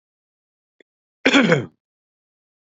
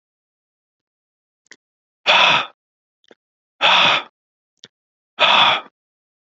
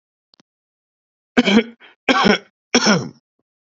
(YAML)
cough_length: 2.7 s
cough_amplitude: 28056
cough_signal_mean_std_ratio: 0.28
exhalation_length: 6.4 s
exhalation_amplitude: 27955
exhalation_signal_mean_std_ratio: 0.35
three_cough_length: 3.7 s
three_cough_amplitude: 29079
three_cough_signal_mean_std_ratio: 0.38
survey_phase: beta (2021-08-13 to 2022-03-07)
age: 18-44
gender: Male
wearing_mask: 'No'
symptom_runny_or_blocked_nose: true
symptom_sore_throat: true
symptom_onset: 2 days
smoker_status: Never smoked
respiratory_condition_asthma: false
respiratory_condition_other: false
recruitment_source: Test and Trace
submission_delay: 2 days
covid_test_result: Positive
covid_test_method: RT-qPCR
covid_ct_value: 28.4
covid_ct_gene: N gene